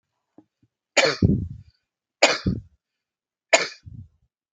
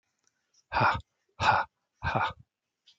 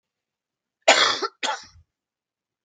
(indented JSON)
{
  "three_cough_length": "4.5 s",
  "three_cough_amplitude": 32768,
  "three_cough_signal_mean_std_ratio": 0.32,
  "exhalation_length": "3.0 s",
  "exhalation_amplitude": 10555,
  "exhalation_signal_mean_std_ratio": 0.4,
  "cough_length": "2.6 s",
  "cough_amplitude": 29790,
  "cough_signal_mean_std_ratio": 0.3,
  "survey_phase": "beta (2021-08-13 to 2022-03-07)",
  "age": "45-64",
  "gender": "Male",
  "wearing_mask": "No",
  "symptom_cough_any": true,
  "smoker_status": "Never smoked",
  "respiratory_condition_asthma": false,
  "respiratory_condition_other": false,
  "recruitment_source": "REACT",
  "submission_delay": "1 day",
  "covid_test_result": "Negative",
  "covid_test_method": "RT-qPCR",
  "influenza_a_test_result": "Negative",
  "influenza_b_test_result": "Negative"
}